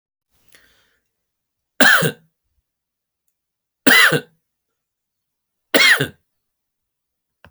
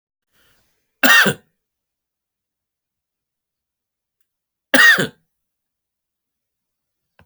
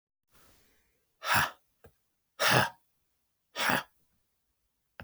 {"three_cough_length": "7.5 s", "three_cough_amplitude": 32768, "three_cough_signal_mean_std_ratio": 0.28, "cough_length": "7.3 s", "cough_amplitude": 32768, "cough_signal_mean_std_ratio": 0.23, "exhalation_length": "5.0 s", "exhalation_amplitude": 16473, "exhalation_signal_mean_std_ratio": 0.31, "survey_phase": "alpha (2021-03-01 to 2021-08-12)", "age": "45-64", "gender": "Male", "wearing_mask": "No", "symptom_fatigue": true, "symptom_onset": "5 days", "smoker_status": "Never smoked", "respiratory_condition_asthma": false, "respiratory_condition_other": false, "recruitment_source": "REACT", "submission_delay": "1 day", "covid_test_result": "Negative", "covid_test_method": "RT-qPCR"}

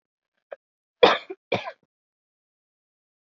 {"cough_length": "3.3 s", "cough_amplitude": 27082, "cough_signal_mean_std_ratio": 0.19, "survey_phase": "beta (2021-08-13 to 2022-03-07)", "age": "18-44", "gender": "Female", "wearing_mask": "No", "symptom_cough_any": true, "symptom_sore_throat": true, "symptom_fatigue": true, "symptom_fever_high_temperature": true, "symptom_onset": "4 days", "smoker_status": "Never smoked", "respiratory_condition_asthma": false, "respiratory_condition_other": false, "recruitment_source": "Test and Trace", "submission_delay": "2 days", "covid_test_result": "Positive", "covid_test_method": "RT-qPCR"}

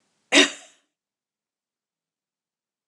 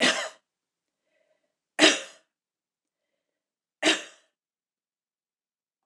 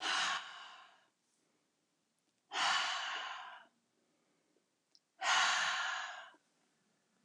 {"cough_length": "2.9 s", "cough_amplitude": 26661, "cough_signal_mean_std_ratio": 0.18, "three_cough_length": "5.9 s", "three_cough_amplitude": 23313, "three_cough_signal_mean_std_ratio": 0.23, "exhalation_length": "7.2 s", "exhalation_amplitude": 3583, "exhalation_signal_mean_std_ratio": 0.47, "survey_phase": "beta (2021-08-13 to 2022-03-07)", "age": "65+", "gender": "Female", "wearing_mask": "No", "symptom_none": true, "smoker_status": "Never smoked", "respiratory_condition_asthma": false, "respiratory_condition_other": false, "recruitment_source": "Test and Trace", "submission_delay": "0 days", "covid_test_result": "Negative", "covid_test_method": "LFT"}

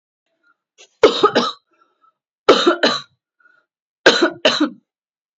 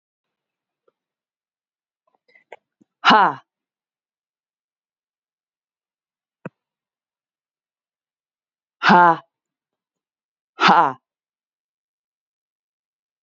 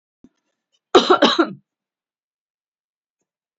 {"three_cough_length": "5.4 s", "three_cough_amplitude": 30852, "three_cough_signal_mean_std_ratio": 0.37, "exhalation_length": "13.2 s", "exhalation_amplitude": 28825, "exhalation_signal_mean_std_ratio": 0.19, "cough_length": "3.6 s", "cough_amplitude": 27574, "cough_signal_mean_std_ratio": 0.26, "survey_phase": "beta (2021-08-13 to 2022-03-07)", "age": "45-64", "gender": "Female", "wearing_mask": "No", "symptom_cough_any": true, "symptom_fatigue": true, "symptom_headache": true, "symptom_change_to_sense_of_smell_or_taste": true, "symptom_loss_of_taste": true, "symptom_onset": "5 days", "smoker_status": "Never smoked", "respiratory_condition_asthma": false, "respiratory_condition_other": false, "recruitment_source": "Test and Trace", "submission_delay": "3 days", "covid_test_result": "Positive", "covid_test_method": "RT-qPCR", "covid_ct_value": 21.9, "covid_ct_gene": "ORF1ab gene", "covid_ct_mean": 22.4, "covid_viral_load": "45000 copies/ml", "covid_viral_load_category": "Low viral load (10K-1M copies/ml)"}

